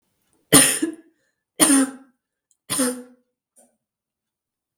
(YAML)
three_cough_length: 4.8 s
three_cough_amplitude: 32768
three_cough_signal_mean_std_ratio: 0.32
survey_phase: beta (2021-08-13 to 2022-03-07)
age: 45-64
gender: Female
wearing_mask: 'No'
symptom_cough_any: true
symptom_sore_throat: true
symptom_onset: 7 days
smoker_status: Never smoked
respiratory_condition_asthma: false
respiratory_condition_other: false
recruitment_source: Test and Trace
submission_delay: 1 day
covid_test_result: Positive
covid_test_method: RT-qPCR
covid_ct_value: 29.1
covid_ct_gene: ORF1ab gene